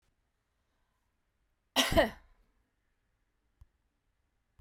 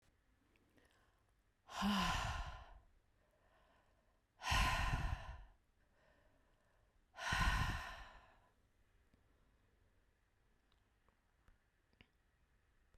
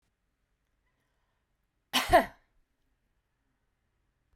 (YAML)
three_cough_length: 4.6 s
three_cough_amplitude: 7766
three_cough_signal_mean_std_ratio: 0.2
exhalation_length: 13.0 s
exhalation_amplitude: 2200
exhalation_signal_mean_std_ratio: 0.37
cough_length: 4.4 s
cough_amplitude: 10178
cough_signal_mean_std_ratio: 0.18
survey_phase: beta (2021-08-13 to 2022-03-07)
age: 65+
gender: Female
wearing_mask: 'No'
symptom_none: true
smoker_status: Ex-smoker
respiratory_condition_asthma: false
respiratory_condition_other: false
recruitment_source: REACT
submission_delay: 2 days
covid_test_result: Negative
covid_test_method: RT-qPCR